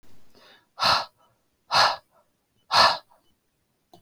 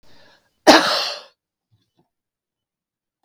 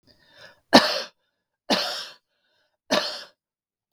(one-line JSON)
{"exhalation_length": "4.0 s", "exhalation_amplitude": 20341, "exhalation_signal_mean_std_ratio": 0.35, "cough_length": "3.2 s", "cough_amplitude": 32768, "cough_signal_mean_std_ratio": 0.25, "three_cough_length": "3.9 s", "three_cough_amplitude": 32768, "three_cough_signal_mean_std_ratio": 0.29, "survey_phase": "beta (2021-08-13 to 2022-03-07)", "age": "65+", "gender": "Female", "wearing_mask": "No", "symptom_none": true, "smoker_status": "Ex-smoker", "respiratory_condition_asthma": false, "respiratory_condition_other": false, "recruitment_source": "REACT", "submission_delay": "2 days", "covid_test_result": "Negative", "covid_test_method": "RT-qPCR", "influenza_a_test_result": "Negative", "influenza_b_test_result": "Negative"}